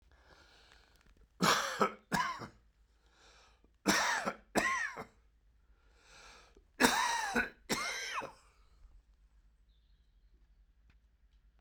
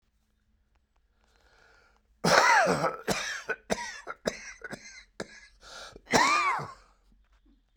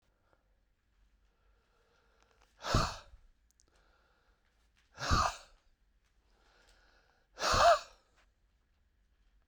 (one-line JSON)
{"three_cough_length": "11.6 s", "three_cough_amplitude": 10422, "three_cough_signal_mean_std_ratio": 0.4, "cough_length": "7.8 s", "cough_amplitude": 19270, "cough_signal_mean_std_ratio": 0.4, "exhalation_length": "9.5 s", "exhalation_amplitude": 6892, "exhalation_signal_mean_std_ratio": 0.25, "survey_phase": "beta (2021-08-13 to 2022-03-07)", "age": "65+", "gender": "Male", "wearing_mask": "No", "symptom_cough_any": true, "symptom_shortness_of_breath": true, "symptom_sore_throat": true, "symptom_fatigue": true, "symptom_headache": true, "symptom_onset": "4 days", "smoker_status": "Ex-smoker", "respiratory_condition_asthma": false, "respiratory_condition_other": false, "recruitment_source": "Test and Trace", "submission_delay": "2 days", "covid_test_result": "Positive", "covid_test_method": "RT-qPCR"}